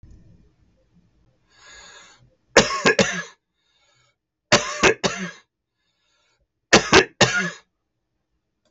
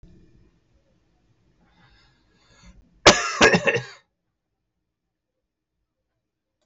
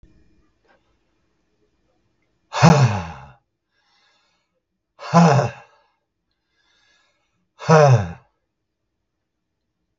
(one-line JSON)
{"three_cough_length": "8.7 s", "three_cough_amplitude": 32768, "three_cough_signal_mean_std_ratio": 0.3, "cough_length": "6.7 s", "cough_amplitude": 32768, "cough_signal_mean_std_ratio": 0.22, "exhalation_length": "10.0 s", "exhalation_amplitude": 32768, "exhalation_signal_mean_std_ratio": 0.28, "survey_phase": "beta (2021-08-13 to 2022-03-07)", "age": "65+", "gender": "Male", "wearing_mask": "No", "symptom_cough_any": true, "symptom_runny_or_blocked_nose": true, "symptom_sore_throat": true, "symptom_abdominal_pain": true, "symptom_diarrhoea": true, "symptom_fatigue": true, "symptom_headache": true, "symptom_change_to_sense_of_smell_or_taste": true, "symptom_onset": "3 days", "smoker_status": "Never smoked", "respiratory_condition_asthma": false, "respiratory_condition_other": false, "recruitment_source": "Test and Trace", "submission_delay": "1 day", "covid_test_result": "Positive", "covid_test_method": "RT-qPCR", "covid_ct_value": 26.3, "covid_ct_gene": "ORF1ab gene", "covid_ct_mean": 26.7, "covid_viral_load": "1700 copies/ml", "covid_viral_load_category": "Minimal viral load (< 10K copies/ml)"}